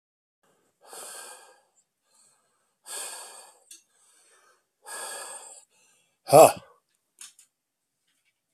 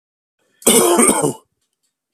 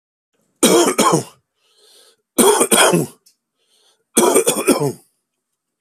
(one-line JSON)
{"exhalation_length": "8.5 s", "exhalation_amplitude": 25261, "exhalation_signal_mean_std_ratio": 0.17, "cough_length": "2.1 s", "cough_amplitude": 32768, "cough_signal_mean_std_ratio": 0.47, "three_cough_length": "5.8 s", "three_cough_amplitude": 32768, "three_cough_signal_mean_std_ratio": 0.47, "survey_phase": "beta (2021-08-13 to 2022-03-07)", "age": "45-64", "gender": "Male", "wearing_mask": "No", "symptom_none": true, "smoker_status": "Ex-smoker", "respiratory_condition_asthma": false, "respiratory_condition_other": false, "recruitment_source": "REACT", "submission_delay": "3 days", "covid_test_result": "Negative", "covid_test_method": "RT-qPCR"}